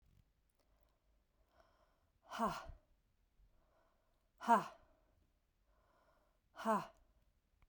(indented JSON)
{
  "exhalation_length": "7.7 s",
  "exhalation_amplitude": 3784,
  "exhalation_signal_mean_std_ratio": 0.23,
  "survey_phase": "beta (2021-08-13 to 2022-03-07)",
  "age": "18-44",
  "gender": "Female",
  "wearing_mask": "No",
  "symptom_cough_any": true,
  "symptom_new_continuous_cough": true,
  "symptom_runny_or_blocked_nose": true,
  "symptom_shortness_of_breath": true,
  "symptom_fatigue": true,
  "symptom_change_to_sense_of_smell_or_taste": true,
  "symptom_loss_of_taste": true,
  "smoker_status": "Never smoked",
  "respiratory_condition_asthma": false,
  "respiratory_condition_other": false,
  "recruitment_source": "Test and Trace",
  "submission_delay": "3 days",
  "covid_test_result": "Positive",
  "covid_test_method": "RT-qPCR",
  "covid_ct_value": 26.5,
  "covid_ct_gene": "ORF1ab gene",
  "covid_ct_mean": 27.2,
  "covid_viral_load": "1200 copies/ml",
  "covid_viral_load_category": "Minimal viral load (< 10K copies/ml)"
}